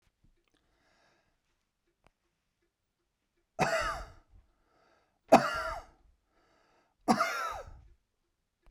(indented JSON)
{
  "three_cough_length": "8.7 s",
  "three_cough_amplitude": 15769,
  "three_cough_signal_mean_std_ratio": 0.25,
  "survey_phase": "beta (2021-08-13 to 2022-03-07)",
  "age": "65+",
  "gender": "Male",
  "wearing_mask": "No",
  "symptom_none": true,
  "smoker_status": "Never smoked",
  "respiratory_condition_asthma": false,
  "respiratory_condition_other": false,
  "recruitment_source": "REACT",
  "submission_delay": "2 days",
  "covid_test_result": "Negative",
  "covid_test_method": "RT-qPCR"
}